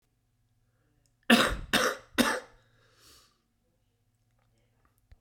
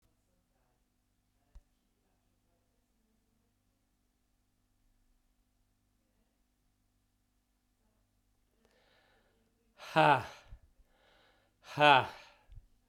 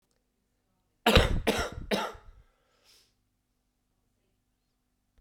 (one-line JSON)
{"three_cough_length": "5.2 s", "three_cough_amplitude": 16158, "three_cough_signal_mean_std_ratio": 0.28, "exhalation_length": "12.9 s", "exhalation_amplitude": 12157, "exhalation_signal_mean_std_ratio": 0.17, "cough_length": "5.2 s", "cough_amplitude": 21266, "cough_signal_mean_std_ratio": 0.28, "survey_phase": "beta (2021-08-13 to 2022-03-07)", "age": "45-64", "gender": "Male", "wearing_mask": "No", "symptom_cough_any": true, "symptom_new_continuous_cough": true, "symptom_shortness_of_breath": true, "symptom_fatigue": true, "symptom_fever_high_temperature": true, "symptom_headache": true, "symptom_onset": "3 days", "smoker_status": "Current smoker (1 to 10 cigarettes per day)", "respiratory_condition_asthma": false, "respiratory_condition_other": false, "recruitment_source": "Test and Trace", "submission_delay": "1 day", "covid_test_result": "Positive", "covid_test_method": "RT-qPCR"}